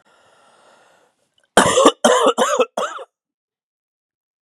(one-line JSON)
{"cough_length": "4.4 s", "cough_amplitude": 32768, "cough_signal_mean_std_ratio": 0.37, "survey_phase": "beta (2021-08-13 to 2022-03-07)", "age": "45-64", "gender": "Male", "wearing_mask": "No", "symptom_cough_any": true, "symptom_new_continuous_cough": true, "symptom_runny_or_blocked_nose": true, "symptom_sore_throat": true, "symptom_fatigue": true, "symptom_fever_high_temperature": true, "symptom_headache": true, "symptom_onset": "5 days", "smoker_status": "Never smoked", "respiratory_condition_asthma": false, "respiratory_condition_other": false, "recruitment_source": "Test and Trace", "submission_delay": "2 days", "covid_test_result": "Positive", "covid_test_method": "RT-qPCR", "covid_ct_value": 22.1, "covid_ct_gene": "ORF1ab gene", "covid_ct_mean": 22.6, "covid_viral_load": "38000 copies/ml", "covid_viral_load_category": "Low viral load (10K-1M copies/ml)"}